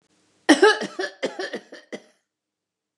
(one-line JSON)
{"cough_length": "3.0 s", "cough_amplitude": 26355, "cough_signal_mean_std_ratio": 0.31, "survey_phase": "beta (2021-08-13 to 2022-03-07)", "age": "45-64", "gender": "Female", "wearing_mask": "No", "symptom_none": true, "smoker_status": "Never smoked", "respiratory_condition_asthma": false, "respiratory_condition_other": false, "recruitment_source": "REACT", "submission_delay": "2 days", "covid_test_result": "Negative", "covid_test_method": "RT-qPCR", "influenza_a_test_result": "Negative", "influenza_b_test_result": "Negative"}